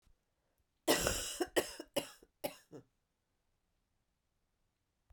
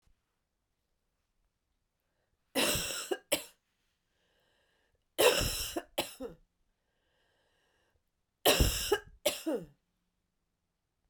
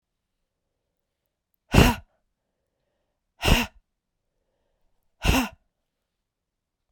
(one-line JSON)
{"cough_length": "5.1 s", "cough_amplitude": 5791, "cough_signal_mean_std_ratio": 0.3, "three_cough_length": "11.1 s", "three_cough_amplitude": 9318, "three_cough_signal_mean_std_ratio": 0.32, "exhalation_length": "6.9 s", "exhalation_amplitude": 27695, "exhalation_signal_mean_std_ratio": 0.23, "survey_phase": "beta (2021-08-13 to 2022-03-07)", "age": "18-44", "gender": "Female", "wearing_mask": "No", "symptom_cough_any": true, "symptom_runny_or_blocked_nose": true, "symptom_shortness_of_breath": true, "symptom_sore_throat": true, "symptom_fatigue": true, "symptom_fever_high_temperature": true, "symptom_headache": true, "smoker_status": "Never smoked", "respiratory_condition_asthma": false, "respiratory_condition_other": false, "recruitment_source": "Test and Trace", "submission_delay": "2 days", "covid_test_result": "Positive", "covid_test_method": "RT-qPCR", "covid_ct_value": 12.2, "covid_ct_gene": "ORF1ab gene", "covid_ct_mean": 13.3, "covid_viral_load": "44000000 copies/ml", "covid_viral_load_category": "High viral load (>1M copies/ml)"}